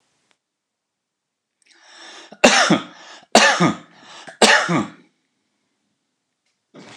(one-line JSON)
{"three_cough_length": "7.0 s", "three_cough_amplitude": 29204, "three_cough_signal_mean_std_ratio": 0.33, "survey_phase": "alpha (2021-03-01 to 2021-08-12)", "age": "45-64", "gender": "Male", "wearing_mask": "No", "symptom_none": true, "smoker_status": "Ex-smoker", "respiratory_condition_asthma": false, "respiratory_condition_other": false, "recruitment_source": "REACT", "submission_delay": "1 day", "covid_test_result": "Negative", "covid_test_method": "RT-qPCR"}